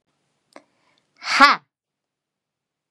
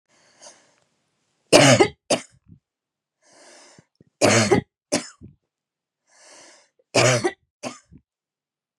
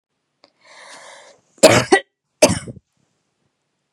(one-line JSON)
{"exhalation_length": "2.9 s", "exhalation_amplitude": 32767, "exhalation_signal_mean_std_ratio": 0.22, "three_cough_length": "8.8 s", "three_cough_amplitude": 32767, "three_cough_signal_mean_std_ratio": 0.3, "cough_length": "3.9 s", "cough_amplitude": 32768, "cough_signal_mean_std_ratio": 0.26, "survey_phase": "beta (2021-08-13 to 2022-03-07)", "age": "45-64", "gender": "Female", "wearing_mask": "No", "symptom_runny_or_blocked_nose": true, "symptom_fatigue": true, "symptom_headache": true, "symptom_onset": "12 days", "smoker_status": "Never smoked", "respiratory_condition_asthma": false, "respiratory_condition_other": false, "recruitment_source": "REACT", "submission_delay": "1 day", "covid_test_result": "Negative", "covid_test_method": "RT-qPCR", "influenza_a_test_result": "Negative", "influenza_b_test_result": "Negative"}